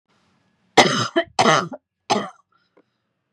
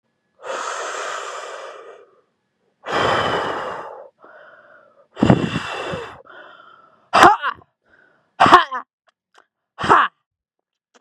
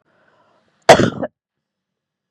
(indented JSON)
{
  "three_cough_length": "3.3 s",
  "three_cough_amplitude": 32768,
  "three_cough_signal_mean_std_ratio": 0.36,
  "exhalation_length": "11.0 s",
  "exhalation_amplitude": 32768,
  "exhalation_signal_mean_std_ratio": 0.36,
  "cough_length": "2.3 s",
  "cough_amplitude": 32768,
  "cough_signal_mean_std_ratio": 0.23,
  "survey_phase": "beta (2021-08-13 to 2022-03-07)",
  "age": "18-44",
  "gender": "Female",
  "wearing_mask": "Yes",
  "symptom_runny_or_blocked_nose": true,
  "symptom_sore_throat": true,
  "symptom_onset": "2 days",
  "smoker_status": "Current smoker (1 to 10 cigarettes per day)",
  "respiratory_condition_asthma": false,
  "respiratory_condition_other": false,
  "recruitment_source": "Test and Trace",
  "submission_delay": "2 days",
  "covid_test_result": "Positive",
  "covid_test_method": "RT-qPCR",
  "covid_ct_value": 16.9,
  "covid_ct_gene": "ORF1ab gene",
  "covid_ct_mean": 17.3,
  "covid_viral_load": "2100000 copies/ml",
  "covid_viral_load_category": "High viral load (>1M copies/ml)"
}